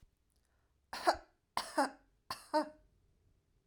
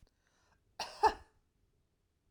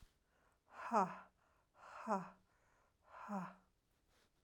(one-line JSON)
{"three_cough_length": "3.7 s", "three_cough_amplitude": 5702, "three_cough_signal_mean_std_ratio": 0.3, "cough_length": "2.3 s", "cough_amplitude": 5645, "cough_signal_mean_std_ratio": 0.2, "exhalation_length": "4.4 s", "exhalation_amplitude": 2291, "exhalation_signal_mean_std_ratio": 0.33, "survey_phase": "beta (2021-08-13 to 2022-03-07)", "age": "18-44", "gender": "Female", "wearing_mask": "No", "symptom_none": true, "smoker_status": "Never smoked", "respiratory_condition_asthma": false, "respiratory_condition_other": false, "recruitment_source": "REACT", "submission_delay": "3 days", "covid_test_result": "Negative", "covid_test_method": "RT-qPCR", "influenza_a_test_result": "Negative", "influenza_b_test_result": "Negative"}